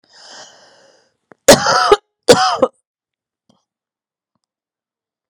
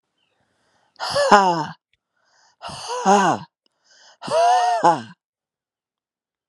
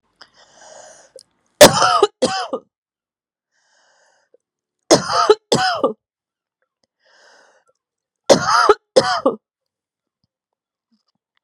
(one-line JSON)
{"cough_length": "5.3 s", "cough_amplitude": 32768, "cough_signal_mean_std_ratio": 0.28, "exhalation_length": "6.5 s", "exhalation_amplitude": 32767, "exhalation_signal_mean_std_ratio": 0.43, "three_cough_length": "11.4 s", "three_cough_amplitude": 32768, "three_cough_signal_mean_std_ratio": 0.3, "survey_phase": "beta (2021-08-13 to 2022-03-07)", "age": "45-64", "gender": "Female", "wearing_mask": "No", "symptom_cough_any": true, "symptom_runny_or_blocked_nose": true, "symptom_fatigue": true, "symptom_fever_high_temperature": true, "symptom_headache": true, "symptom_onset": "2 days", "smoker_status": "Ex-smoker", "respiratory_condition_asthma": false, "respiratory_condition_other": false, "recruitment_source": "Test and Trace", "submission_delay": "1 day", "covid_test_result": "Positive", "covid_test_method": "RT-qPCR", "covid_ct_value": 20.2, "covid_ct_gene": "ORF1ab gene"}